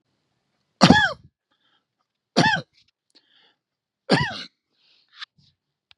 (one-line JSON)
{"three_cough_length": "6.0 s", "three_cough_amplitude": 32767, "three_cough_signal_mean_std_ratio": 0.26, "survey_phase": "beta (2021-08-13 to 2022-03-07)", "age": "18-44", "gender": "Male", "wearing_mask": "No", "symptom_none": true, "smoker_status": "Never smoked", "respiratory_condition_asthma": true, "respiratory_condition_other": false, "recruitment_source": "REACT", "submission_delay": "1 day", "covid_test_result": "Negative", "covid_test_method": "RT-qPCR", "influenza_a_test_result": "Negative", "influenza_b_test_result": "Negative"}